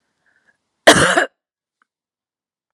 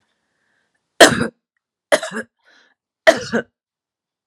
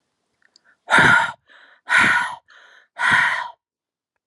{"cough_length": "2.7 s", "cough_amplitude": 32768, "cough_signal_mean_std_ratio": 0.27, "three_cough_length": "4.3 s", "three_cough_amplitude": 32768, "three_cough_signal_mean_std_ratio": 0.25, "exhalation_length": "4.3 s", "exhalation_amplitude": 27801, "exhalation_signal_mean_std_ratio": 0.45, "survey_phase": "beta (2021-08-13 to 2022-03-07)", "age": "45-64", "gender": "Female", "wearing_mask": "No", "symptom_cough_any": true, "smoker_status": "Never smoked", "respiratory_condition_asthma": true, "respiratory_condition_other": false, "recruitment_source": "REACT", "submission_delay": "3 days", "covid_test_result": "Negative", "covid_test_method": "RT-qPCR", "influenza_a_test_result": "Negative", "influenza_b_test_result": "Negative"}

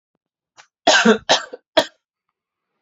{"three_cough_length": "2.8 s", "three_cough_amplitude": 28551, "three_cough_signal_mean_std_ratio": 0.33, "survey_phase": "beta (2021-08-13 to 2022-03-07)", "age": "18-44", "gender": "Male", "wearing_mask": "No", "symptom_runny_or_blocked_nose": true, "symptom_shortness_of_breath": true, "symptom_fatigue": true, "symptom_headache": true, "smoker_status": "Ex-smoker", "respiratory_condition_asthma": false, "respiratory_condition_other": false, "recruitment_source": "Test and Trace", "submission_delay": "2 days", "covid_test_result": "Positive", "covid_test_method": "RT-qPCR", "covid_ct_value": 19.3, "covid_ct_gene": "ORF1ab gene", "covid_ct_mean": 20.5, "covid_viral_load": "190000 copies/ml", "covid_viral_load_category": "Low viral load (10K-1M copies/ml)"}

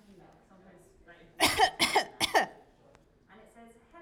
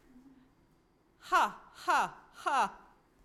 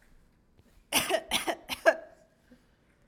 {"three_cough_length": "4.0 s", "three_cough_amplitude": 11265, "three_cough_signal_mean_std_ratio": 0.36, "exhalation_length": "3.2 s", "exhalation_amplitude": 5036, "exhalation_signal_mean_std_ratio": 0.41, "cough_length": "3.1 s", "cough_amplitude": 15029, "cough_signal_mean_std_ratio": 0.34, "survey_phase": "alpha (2021-03-01 to 2021-08-12)", "age": "45-64", "gender": "Female", "wearing_mask": "No", "symptom_fatigue": true, "smoker_status": "Never smoked", "respiratory_condition_asthma": false, "respiratory_condition_other": false, "recruitment_source": "REACT", "submission_delay": "1 day", "covid_test_result": "Negative", "covid_test_method": "RT-qPCR"}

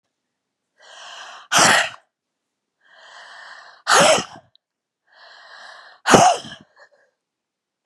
{"exhalation_length": "7.9 s", "exhalation_amplitude": 32768, "exhalation_signal_mean_std_ratio": 0.31, "survey_phase": "beta (2021-08-13 to 2022-03-07)", "age": "65+", "gender": "Female", "wearing_mask": "No", "symptom_cough_any": true, "symptom_runny_or_blocked_nose": true, "symptom_sore_throat": true, "symptom_fatigue": true, "symptom_change_to_sense_of_smell_or_taste": true, "symptom_loss_of_taste": true, "symptom_onset": "6 days", "smoker_status": "Never smoked", "respiratory_condition_asthma": false, "respiratory_condition_other": true, "recruitment_source": "Test and Trace", "submission_delay": "2 days", "covid_test_result": "Positive", "covid_test_method": "RT-qPCR", "covid_ct_value": 14.8, "covid_ct_gene": "S gene", "covid_ct_mean": 15.2, "covid_viral_load": "10000000 copies/ml", "covid_viral_load_category": "High viral load (>1M copies/ml)"}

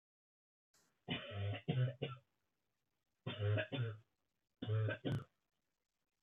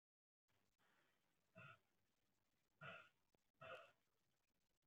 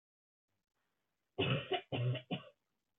{"three_cough_length": "6.2 s", "three_cough_amplitude": 1783, "three_cough_signal_mean_std_ratio": 0.49, "exhalation_length": "4.9 s", "exhalation_amplitude": 191, "exhalation_signal_mean_std_ratio": 0.37, "cough_length": "3.0 s", "cough_amplitude": 2445, "cough_signal_mean_std_ratio": 0.42, "survey_phase": "beta (2021-08-13 to 2022-03-07)", "age": "18-44", "gender": "Female", "wearing_mask": "No", "symptom_cough_any": true, "symptom_runny_or_blocked_nose": true, "symptom_shortness_of_breath": true, "symptom_sore_throat": true, "symptom_fatigue": true, "symptom_fever_high_temperature": true, "symptom_headache": true, "symptom_other": true, "symptom_onset": "4 days", "smoker_status": "Ex-smoker", "respiratory_condition_asthma": false, "respiratory_condition_other": false, "recruitment_source": "Test and Trace", "submission_delay": "1 day", "covid_test_result": "Positive", "covid_test_method": "RT-qPCR", "covid_ct_value": 22.6, "covid_ct_gene": "ORF1ab gene", "covid_ct_mean": 23.2, "covid_viral_load": "25000 copies/ml", "covid_viral_load_category": "Low viral load (10K-1M copies/ml)"}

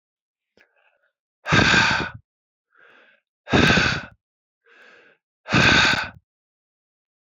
{"exhalation_length": "7.3 s", "exhalation_amplitude": 25013, "exhalation_signal_mean_std_ratio": 0.39, "survey_phase": "beta (2021-08-13 to 2022-03-07)", "age": "45-64", "gender": "Male", "wearing_mask": "No", "symptom_cough_any": true, "symptom_sore_throat": true, "symptom_fatigue": true, "symptom_headache": true, "smoker_status": "Ex-smoker", "respiratory_condition_asthma": false, "respiratory_condition_other": false, "recruitment_source": "Test and Trace", "submission_delay": "2 days", "covid_test_result": "Positive", "covid_test_method": "RT-qPCR"}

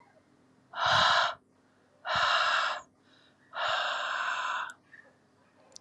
{"exhalation_length": "5.8 s", "exhalation_amplitude": 8078, "exhalation_signal_mean_std_ratio": 0.56, "survey_phase": "alpha (2021-03-01 to 2021-08-12)", "age": "65+", "gender": "Female", "wearing_mask": "No", "symptom_cough_any": true, "symptom_fatigue": true, "symptom_headache": true, "smoker_status": "Ex-smoker", "respiratory_condition_asthma": false, "respiratory_condition_other": false, "recruitment_source": "Test and Trace", "submission_delay": "2 days", "covid_test_result": "Positive", "covid_test_method": "RT-qPCR", "covid_ct_value": 33.9, "covid_ct_gene": "N gene"}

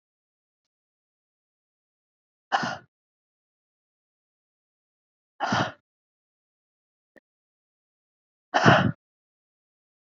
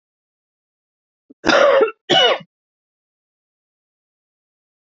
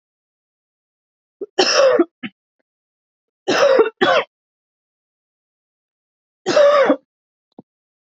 {"exhalation_length": "10.2 s", "exhalation_amplitude": 26579, "exhalation_signal_mean_std_ratio": 0.2, "cough_length": "4.9 s", "cough_amplitude": 26406, "cough_signal_mean_std_ratio": 0.31, "three_cough_length": "8.1 s", "three_cough_amplitude": 31541, "three_cough_signal_mean_std_ratio": 0.37, "survey_phase": "beta (2021-08-13 to 2022-03-07)", "age": "45-64", "gender": "Female", "wearing_mask": "No", "symptom_shortness_of_breath": true, "smoker_status": "Never smoked", "respiratory_condition_asthma": true, "respiratory_condition_other": false, "recruitment_source": "Test and Trace", "submission_delay": "1 day", "covid_test_result": "Positive", "covid_test_method": "RT-qPCR", "covid_ct_value": 31.6, "covid_ct_gene": "ORF1ab gene", "covid_ct_mean": 31.8, "covid_viral_load": "38 copies/ml", "covid_viral_load_category": "Minimal viral load (< 10K copies/ml)"}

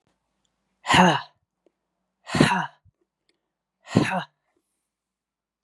{"exhalation_length": "5.6 s", "exhalation_amplitude": 29031, "exhalation_signal_mean_std_ratio": 0.3, "survey_phase": "beta (2021-08-13 to 2022-03-07)", "age": "45-64", "gender": "Female", "wearing_mask": "No", "symptom_none": true, "smoker_status": "Ex-smoker", "respiratory_condition_asthma": false, "respiratory_condition_other": false, "recruitment_source": "REACT", "submission_delay": "6 days", "covid_test_result": "Negative", "covid_test_method": "RT-qPCR", "influenza_a_test_result": "Negative", "influenza_b_test_result": "Negative"}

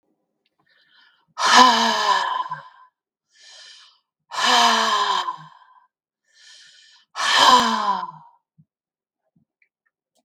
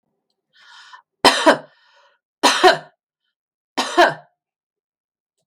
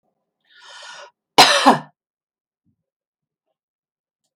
{"exhalation_length": "10.2 s", "exhalation_amplitude": 32768, "exhalation_signal_mean_std_ratio": 0.43, "three_cough_length": "5.5 s", "three_cough_amplitude": 32768, "three_cough_signal_mean_std_ratio": 0.31, "cough_length": "4.4 s", "cough_amplitude": 32768, "cough_signal_mean_std_ratio": 0.23, "survey_phase": "beta (2021-08-13 to 2022-03-07)", "age": "65+", "gender": "Female", "wearing_mask": "No", "symptom_none": true, "smoker_status": "Ex-smoker", "respiratory_condition_asthma": false, "respiratory_condition_other": false, "recruitment_source": "REACT", "submission_delay": "3 days", "covid_test_result": "Negative", "covid_test_method": "RT-qPCR", "influenza_a_test_result": "Negative", "influenza_b_test_result": "Negative"}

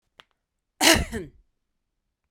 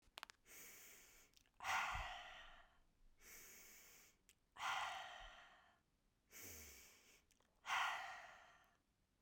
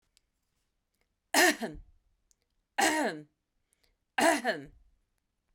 {"cough_length": "2.3 s", "cough_amplitude": 27350, "cough_signal_mean_std_ratio": 0.27, "exhalation_length": "9.2 s", "exhalation_amplitude": 1104, "exhalation_signal_mean_std_ratio": 0.46, "three_cough_length": "5.5 s", "three_cough_amplitude": 13194, "three_cough_signal_mean_std_ratio": 0.34, "survey_phase": "beta (2021-08-13 to 2022-03-07)", "age": "45-64", "gender": "Female", "wearing_mask": "No", "symptom_none": true, "smoker_status": "Never smoked", "respiratory_condition_asthma": false, "respiratory_condition_other": false, "recruitment_source": "REACT", "submission_delay": "1 day", "covid_test_result": "Negative", "covid_test_method": "RT-qPCR"}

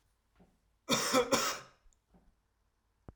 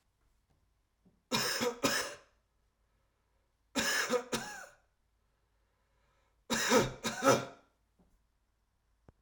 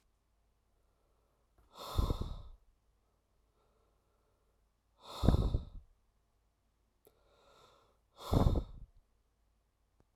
{"cough_length": "3.2 s", "cough_amplitude": 6883, "cough_signal_mean_std_ratio": 0.36, "three_cough_length": "9.2 s", "three_cough_amplitude": 8054, "three_cough_signal_mean_std_ratio": 0.37, "exhalation_length": "10.2 s", "exhalation_amplitude": 9646, "exhalation_signal_mean_std_ratio": 0.27, "survey_phase": "alpha (2021-03-01 to 2021-08-12)", "age": "18-44", "gender": "Male", "wearing_mask": "No", "symptom_none": true, "smoker_status": "Ex-smoker", "respiratory_condition_asthma": false, "respiratory_condition_other": false, "recruitment_source": "REACT", "submission_delay": "1 day", "covid_test_result": "Negative", "covid_test_method": "RT-qPCR"}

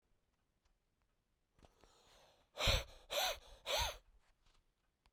{"exhalation_length": "5.1 s", "exhalation_amplitude": 2735, "exhalation_signal_mean_std_ratio": 0.33, "survey_phase": "beta (2021-08-13 to 2022-03-07)", "age": "45-64", "gender": "Male", "wearing_mask": "No", "symptom_cough_any": true, "symptom_runny_or_blocked_nose": true, "symptom_shortness_of_breath": true, "symptom_sore_throat": true, "symptom_fatigue": true, "symptom_headache": true, "symptom_change_to_sense_of_smell_or_taste": true, "symptom_other": true, "symptom_onset": "4 days", "smoker_status": "Ex-smoker", "respiratory_condition_asthma": false, "respiratory_condition_other": false, "recruitment_source": "Test and Trace", "submission_delay": "2 days", "covid_test_result": "Positive", "covid_test_method": "RT-qPCR", "covid_ct_value": 17.0, "covid_ct_gene": "ORF1ab gene"}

